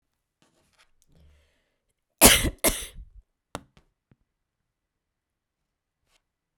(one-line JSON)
{"cough_length": "6.6 s", "cough_amplitude": 32768, "cough_signal_mean_std_ratio": 0.18, "survey_phase": "beta (2021-08-13 to 2022-03-07)", "age": "45-64", "gender": "Female", "wearing_mask": "No", "symptom_runny_or_blocked_nose": true, "symptom_shortness_of_breath": true, "symptom_fatigue": true, "symptom_headache": true, "symptom_change_to_sense_of_smell_or_taste": true, "symptom_loss_of_taste": true, "symptom_onset": "3 days", "smoker_status": "Never smoked", "respiratory_condition_asthma": false, "respiratory_condition_other": false, "recruitment_source": "Test and Trace", "submission_delay": "2 days", "covid_test_result": "Positive", "covid_test_method": "RT-qPCR"}